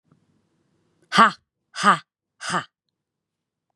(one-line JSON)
{"exhalation_length": "3.8 s", "exhalation_amplitude": 32558, "exhalation_signal_mean_std_ratio": 0.25, "survey_phase": "beta (2021-08-13 to 2022-03-07)", "age": "18-44", "gender": "Female", "wearing_mask": "No", "symptom_none": true, "smoker_status": "Ex-smoker", "respiratory_condition_asthma": false, "respiratory_condition_other": false, "recruitment_source": "REACT", "submission_delay": "2 days", "covid_test_result": "Negative", "covid_test_method": "RT-qPCR", "influenza_a_test_result": "Negative", "influenza_b_test_result": "Negative"}